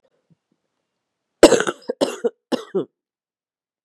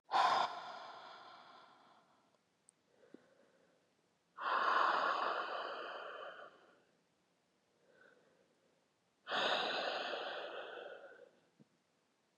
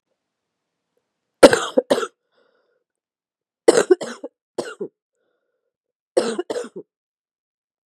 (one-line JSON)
{"cough_length": "3.8 s", "cough_amplitude": 32768, "cough_signal_mean_std_ratio": 0.24, "exhalation_length": "12.4 s", "exhalation_amplitude": 2996, "exhalation_signal_mean_std_ratio": 0.46, "three_cough_length": "7.9 s", "three_cough_amplitude": 32768, "three_cough_signal_mean_std_ratio": 0.23, "survey_phase": "beta (2021-08-13 to 2022-03-07)", "age": "18-44", "gender": "Female", "wearing_mask": "No", "symptom_cough_any": true, "symptom_runny_or_blocked_nose": true, "symptom_fatigue": true, "symptom_fever_high_temperature": true, "symptom_headache": true, "symptom_onset": "3 days", "smoker_status": "Never smoked", "respiratory_condition_asthma": false, "respiratory_condition_other": false, "recruitment_source": "Test and Trace", "submission_delay": "2 days", "covid_test_result": "Positive", "covid_test_method": "RT-qPCR", "covid_ct_value": 25.9, "covid_ct_gene": "N gene"}